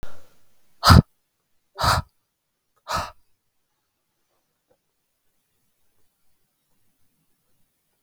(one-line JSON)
{"exhalation_length": "8.0 s", "exhalation_amplitude": 32768, "exhalation_signal_mean_std_ratio": 0.2, "survey_phase": "beta (2021-08-13 to 2022-03-07)", "age": "18-44", "gender": "Male", "wearing_mask": "No", "symptom_fatigue": true, "symptom_onset": "10 days", "smoker_status": "Current smoker (11 or more cigarettes per day)", "respiratory_condition_asthma": false, "respiratory_condition_other": false, "recruitment_source": "REACT", "submission_delay": "2 days", "covid_test_result": "Negative", "covid_test_method": "RT-qPCR"}